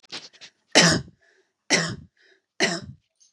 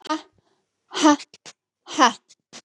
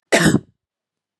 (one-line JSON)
{"three_cough_length": "3.3 s", "three_cough_amplitude": 30232, "three_cough_signal_mean_std_ratio": 0.35, "exhalation_length": "2.6 s", "exhalation_amplitude": 29441, "exhalation_signal_mean_std_ratio": 0.32, "cough_length": "1.2 s", "cough_amplitude": 31440, "cough_signal_mean_std_ratio": 0.38, "survey_phase": "beta (2021-08-13 to 2022-03-07)", "age": "18-44", "gender": "Female", "wearing_mask": "No", "symptom_none": true, "smoker_status": "Never smoked", "respiratory_condition_asthma": false, "respiratory_condition_other": false, "recruitment_source": "REACT", "submission_delay": "0 days", "covid_test_result": "Negative", "covid_test_method": "RT-qPCR", "influenza_a_test_result": "Negative", "influenza_b_test_result": "Negative"}